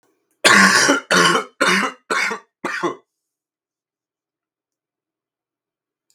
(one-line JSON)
{"cough_length": "6.1 s", "cough_amplitude": 32768, "cough_signal_mean_std_ratio": 0.4, "survey_phase": "beta (2021-08-13 to 2022-03-07)", "age": "18-44", "gender": "Male", "wearing_mask": "No", "symptom_cough_any": true, "symptom_new_continuous_cough": true, "symptom_runny_or_blocked_nose": true, "symptom_sore_throat": true, "symptom_fatigue": true, "symptom_fever_high_temperature": true, "symptom_headache": true, "symptom_other": true, "symptom_onset": "3 days", "smoker_status": "Never smoked", "respiratory_condition_asthma": false, "respiratory_condition_other": false, "recruitment_source": "Test and Trace", "submission_delay": "1 day", "covid_test_result": "Positive", "covid_test_method": "RT-qPCR", "covid_ct_value": 24.8, "covid_ct_gene": "N gene", "covid_ct_mean": 24.8, "covid_viral_load": "7100 copies/ml", "covid_viral_load_category": "Minimal viral load (< 10K copies/ml)"}